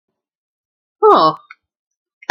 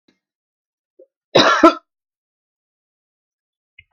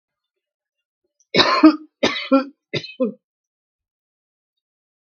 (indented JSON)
{
  "exhalation_length": "2.3 s",
  "exhalation_amplitude": 32768,
  "exhalation_signal_mean_std_ratio": 0.3,
  "cough_length": "3.9 s",
  "cough_amplitude": 32768,
  "cough_signal_mean_std_ratio": 0.23,
  "three_cough_length": "5.1 s",
  "three_cough_amplitude": 32768,
  "three_cough_signal_mean_std_ratio": 0.29,
  "survey_phase": "beta (2021-08-13 to 2022-03-07)",
  "age": "65+",
  "gender": "Female",
  "wearing_mask": "No",
  "symptom_cough_any": true,
  "symptom_shortness_of_breath": true,
  "smoker_status": "Ex-smoker",
  "respiratory_condition_asthma": false,
  "respiratory_condition_other": false,
  "recruitment_source": "REACT",
  "submission_delay": "6 days",
  "covid_test_result": "Negative",
  "covid_test_method": "RT-qPCR",
  "influenza_a_test_result": "Negative",
  "influenza_b_test_result": "Negative"
}